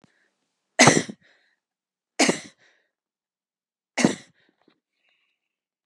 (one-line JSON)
{"three_cough_length": "5.9 s", "three_cough_amplitude": 30752, "three_cough_signal_mean_std_ratio": 0.22, "survey_phase": "beta (2021-08-13 to 2022-03-07)", "age": "45-64", "gender": "Female", "wearing_mask": "No", "symptom_cough_any": true, "symptom_fever_high_temperature": true, "symptom_change_to_sense_of_smell_or_taste": true, "symptom_onset": "6 days", "smoker_status": "Never smoked", "respiratory_condition_asthma": false, "respiratory_condition_other": false, "recruitment_source": "Test and Trace", "submission_delay": "2 days", "covid_test_result": "Positive", "covid_test_method": "RT-qPCR"}